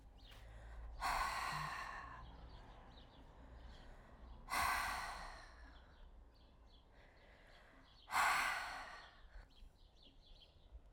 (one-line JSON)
{"exhalation_length": "10.9 s", "exhalation_amplitude": 2218, "exhalation_signal_mean_std_ratio": 0.55, "survey_phase": "alpha (2021-03-01 to 2021-08-12)", "age": "45-64", "gender": "Female", "wearing_mask": "No", "symptom_cough_any": true, "symptom_diarrhoea": true, "symptom_fatigue": true, "symptom_change_to_sense_of_smell_or_taste": true, "symptom_loss_of_taste": true, "smoker_status": "Ex-smoker", "respiratory_condition_asthma": false, "respiratory_condition_other": false, "recruitment_source": "Test and Trace", "submission_delay": "0 days", "covid_test_result": "Negative", "covid_test_method": "LFT"}